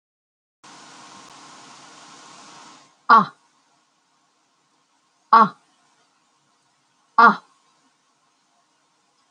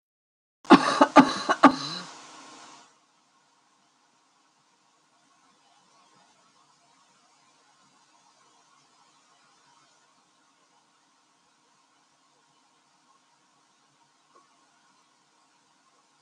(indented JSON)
{
  "exhalation_length": "9.3 s",
  "exhalation_amplitude": 28510,
  "exhalation_signal_mean_std_ratio": 0.2,
  "cough_length": "16.2 s",
  "cough_amplitude": 27774,
  "cough_signal_mean_std_ratio": 0.16,
  "survey_phase": "alpha (2021-03-01 to 2021-08-12)",
  "age": "65+",
  "gender": "Female",
  "wearing_mask": "No",
  "symptom_none": true,
  "smoker_status": "Never smoked",
  "respiratory_condition_asthma": false,
  "respiratory_condition_other": false,
  "recruitment_source": "REACT",
  "submission_delay": "2 days",
  "covid_test_result": "Negative",
  "covid_test_method": "RT-qPCR"
}